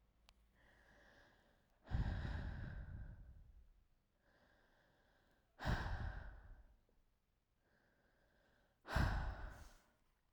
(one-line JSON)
{"exhalation_length": "10.3 s", "exhalation_amplitude": 1731, "exhalation_signal_mean_std_ratio": 0.42, "survey_phase": "alpha (2021-03-01 to 2021-08-12)", "age": "18-44", "gender": "Female", "wearing_mask": "No", "symptom_none": true, "smoker_status": "Never smoked", "respiratory_condition_asthma": false, "respiratory_condition_other": false, "recruitment_source": "REACT", "submission_delay": "2 days", "covid_test_result": "Negative", "covid_test_method": "RT-qPCR"}